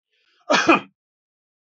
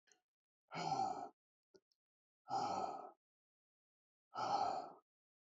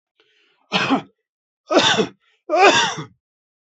{"cough_length": "1.6 s", "cough_amplitude": 26667, "cough_signal_mean_std_ratio": 0.32, "exhalation_length": "5.5 s", "exhalation_amplitude": 1580, "exhalation_signal_mean_std_ratio": 0.46, "three_cough_length": "3.8 s", "three_cough_amplitude": 27701, "three_cough_signal_mean_std_ratio": 0.43, "survey_phase": "beta (2021-08-13 to 2022-03-07)", "age": "45-64", "gender": "Male", "wearing_mask": "No", "symptom_cough_any": true, "symptom_diarrhoea": true, "symptom_headache": true, "symptom_change_to_sense_of_smell_or_taste": true, "smoker_status": "Never smoked", "respiratory_condition_asthma": true, "respiratory_condition_other": false, "recruitment_source": "Test and Trace", "submission_delay": "1 day", "covid_test_result": "Positive", "covid_test_method": "RT-qPCR", "covid_ct_value": 19.9, "covid_ct_gene": "ORF1ab gene", "covid_ct_mean": 20.4, "covid_viral_load": "200000 copies/ml", "covid_viral_load_category": "Low viral load (10K-1M copies/ml)"}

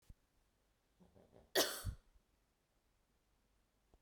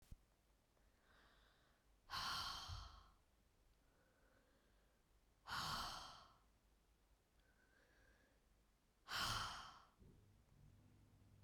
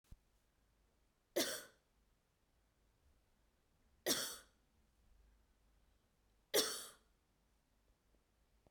{"cough_length": "4.0 s", "cough_amplitude": 3342, "cough_signal_mean_std_ratio": 0.23, "exhalation_length": "11.4 s", "exhalation_amplitude": 800, "exhalation_signal_mean_std_ratio": 0.42, "three_cough_length": "8.7 s", "three_cough_amplitude": 3029, "three_cough_signal_mean_std_ratio": 0.25, "survey_phase": "beta (2021-08-13 to 2022-03-07)", "age": "45-64", "gender": "Female", "wearing_mask": "No", "symptom_none": true, "smoker_status": "Ex-smoker", "respiratory_condition_asthma": false, "respiratory_condition_other": false, "recruitment_source": "REACT", "submission_delay": "0 days", "covid_test_result": "Negative", "covid_test_method": "RT-qPCR", "influenza_a_test_result": "Negative", "influenza_b_test_result": "Negative"}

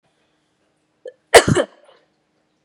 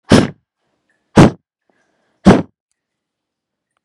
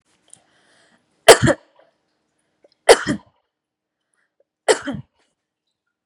{"cough_length": "2.6 s", "cough_amplitude": 32768, "cough_signal_mean_std_ratio": 0.22, "exhalation_length": "3.8 s", "exhalation_amplitude": 32768, "exhalation_signal_mean_std_ratio": 0.27, "three_cough_length": "6.1 s", "three_cough_amplitude": 32768, "three_cough_signal_mean_std_ratio": 0.2, "survey_phase": "beta (2021-08-13 to 2022-03-07)", "age": "18-44", "gender": "Female", "wearing_mask": "No", "symptom_sore_throat": true, "smoker_status": "Never smoked", "respiratory_condition_asthma": false, "respiratory_condition_other": false, "recruitment_source": "REACT", "submission_delay": "1 day", "covid_test_result": "Negative", "covid_test_method": "RT-qPCR", "influenza_a_test_result": "Negative", "influenza_b_test_result": "Negative"}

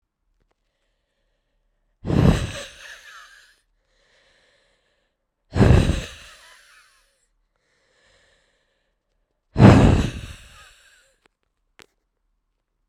{"exhalation_length": "12.9 s", "exhalation_amplitude": 32768, "exhalation_signal_mean_std_ratio": 0.26, "survey_phase": "beta (2021-08-13 to 2022-03-07)", "age": "18-44", "gender": "Female", "wearing_mask": "No", "symptom_cough_any": true, "symptom_runny_or_blocked_nose": true, "symptom_shortness_of_breath": true, "symptom_diarrhoea": true, "symptom_fatigue": true, "symptom_headache": true, "symptom_change_to_sense_of_smell_or_taste": true, "symptom_loss_of_taste": true, "symptom_other": true, "symptom_onset": "4 days", "smoker_status": "Current smoker (e-cigarettes or vapes only)", "respiratory_condition_asthma": false, "respiratory_condition_other": false, "recruitment_source": "Test and Trace", "submission_delay": "2 days", "covid_test_result": "Positive", "covid_test_method": "RT-qPCR", "covid_ct_value": 19.9, "covid_ct_gene": "ORF1ab gene", "covid_ct_mean": 20.6, "covid_viral_load": "170000 copies/ml", "covid_viral_load_category": "Low viral load (10K-1M copies/ml)"}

